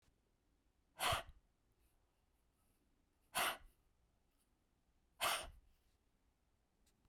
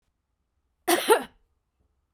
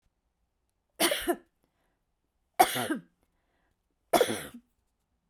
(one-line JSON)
{"exhalation_length": "7.1 s", "exhalation_amplitude": 1605, "exhalation_signal_mean_std_ratio": 0.27, "cough_length": "2.1 s", "cough_amplitude": 18246, "cough_signal_mean_std_ratio": 0.28, "three_cough_length": "5.3 s", "three_cough_amplitude": 16602, "three_cough_signal_mean_std_ratio": 0.29, "survey_phase": "beta (2021-08-13 to 2022-03-07)", "age": "45-64", "gender": "Female", "wearing_mask": "No", "symptom_none": true, "symptom_onset": "6 days", "smoker_status": "Never smoked", "respiratory_condition_asthma": true, "respiratory_condition_other": false, "recruitment_source": "REACT", "submission_delay": "1 day", "covid_test_result": "Negative", "covid_test_method": "RT-qPCR", "influenza_a_test_result": "Negative", "influenza_b_test_result": "Negative"}